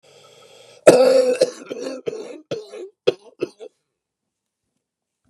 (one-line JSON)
{"cough_length": "5.3 s", "cough_amplitude": 32768, "cough_signal_mean_std_ratio": 0.34, "survey_phase": "beta (2021-08-13 to 2022-03-07)", "age": "65+", "gender": "Male", "wearing_mask": "No", "symptom_cough_any": true, "symptom_shortness_of_breath": true, "symptom_onset": "12 days", "smoker_status": "Ex-smoker", "respiratory_condition_asthma": false, "respiratory_condition_other": true, "recruitment_source": "REACT", "submission_delay": "0 days", "covid_test_result": "Negative", "covid_test_method": "RT-qPCR", "influenza_a_test_result": "Negative", "influenza_b_test_result": "Negative"}